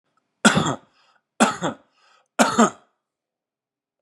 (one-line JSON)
{"three_cough_length": "4.0 s", "three_cough_amplitude": 30952, "three_cough_signal_mean_std_ratio": 0.32, "survey_phase": "beta (2021-08-13 to 2022-03-07)", "age": "65+", "gender": "Male", "wearing_mask": "No", "symptom_runny_or_blocked_nose": true, "smoker_status": "Ex-smoker", "respiratory_condition_asthma": false, "respiratory_condition_other": false, "recruitment_source": "Test and Trace", "submission_delay": "2 days", "covid_test_result": "Negative", "covid_test_method": "RT-qPCR"}